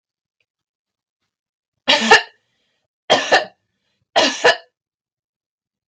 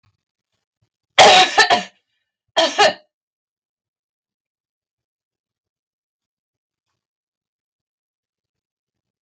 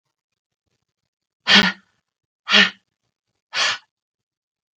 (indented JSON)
{
  "three_cough_length": "5.9 s",
  "three_cough_amplitude": 32768,
  "three_cough_signal_mean_std_ratio": 0.3,
  "cough_length": "9.2 s",
  "cough_amplitude": 32768,
  "cough_signal_mean_std_ratio": 0.24,
  "exhalation_length": "4.8 s",
  "exhalation_amplitude": 32768,
  "exhalation_signal_mean_std_ratio": 0.27,
  "survey_phase": "beta (2021-08-13 to 2022-03-07)",
  "age": "45-64",
  "gender": "Female",
  "wearing_mask": "No",
  "symptom_sore_throat": true,
  "symptom_abdominal_pain": true,
  "symptom_onset": "12 days",
  "smoker_status": "Never smoked",
  "respiratory_condition_asthma": false,
  "respiratory_condition_other": false,
  "recruitment_source": "REACT",
  "submission_delay": "2 days",
  "covid_test_result": "Negative",
  "covid_test_method": "RT-qPCR",
  "influenza_a_test_result": "Negative",
  "influenza_b_test_result": "Negative"
}